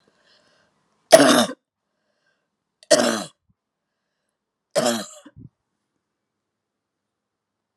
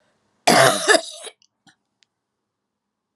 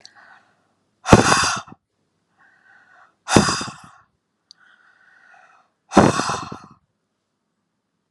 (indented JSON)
{
  "three_cough_length": "7.8 s",
  "three_cough_amplitude": 32768,
  "three_cough_signal_mean_std_ratio": 0.24,
  "cough_length": "3.2 s",
  "cough_amplitude": 31303,
  "cough_signal_mean_std_ratio": 0.31,
  "exhalation_length": "8.1 s",
  "exhalation_amplitude": 32768,
  "exhalation_signal_mean_std_ratio": 0.28,
  "survey_phase": "alpha (2021-03-01 to 2021-08-12)",
  "age": "45-64",
  "gender": "Female",
  "wearing_mask": "No",
  "symptom_none": true,
  "smoker_status": "Never smoked",
  "respiratory_condition_asthma": false,
  "respiratory_condition_other": false,
  "recruitment_source": "REACT",
  "submission_delay": "2 days",
  "covid_test_result": "Negative",
  "covid_test_method": "RT-qPCR"
}